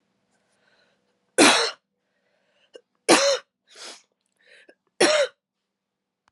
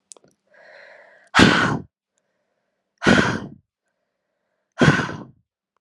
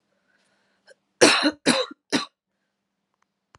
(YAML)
three_cough_length: 6.3 s
three_cough_amplitude: 28736
three_cough_signal_mean_std_ratio: 0.3
exhalation_length: 5.8 s
exhalation_amplitude: 32768
exhalation_signal_mean_std_ratio: 0.33
cough_length: 3.6 s
cough_amplitude: 32331
cough_signal_mean_std_ratio: 0.3
survey_phase: alpha (2021-03-01 to 2021-08-12)
age: 18-44
gender: Female
wearing_mask: 'No'
symptom_cough_any: true
symptom_fatigue: true
symptom_headache: true
symptom_change_to_sense_of_smell_or_taste: true
symptom_loss_of_taste: true
smoker_status: Never smoked
respiratory_condition_asthma: false
respiratory_condition_other: false
recruitment_source: Test and Trace
submission_delay: 1 day
covid_test_result: Positive
covid_test_method: RT-qPCR
covid_ct_value: 13.4
covid_ct_gene: ORF1ab gene
covid_ct_mean: 13.8
covid_viral_load: 30000000 copies/ml
covid_viral_load_category: High viral load (>1M copies/ml)